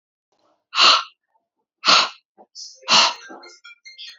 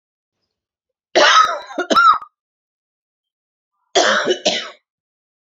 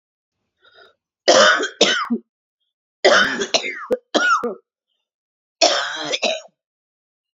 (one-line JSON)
{"exhalation_length": "4.2 s", "exhalation_amplitude": 29623, "exhalation_signal_mean_std_ratio": 0.36, "cough_length": "5.5 s", "cough_amplitude": 29670, "cough_signal_mean_std_ratio": 0.4, "three_cough_length": "7.3 s", "three_cough_amplitude": 32767, "three_cough_signal_mean_std_ratio": 0.44, "survey_phase": "beta (2021-08-13 to 2022-03-07)", "age": "45-64", "gender": "Female", "wearing_mask": "No", "symptom_new_continuous_cough": true, "symptom_runny_or_blocked_nose": true, "symptom_sore_throat": true, "symptom_onset": "3 days", "smoker_status": "Never smoked", "respiratory_condition_asthma": false, "respiratory_condition_other": false, "recruitment_source": "Test and Trace", "submission_delay": "1 day", "covid_test_result": "Positive", "covid_test_method": "RT-qPCR", "covid_ct_value": 19.6, "covid_ct_gene": "N gene"}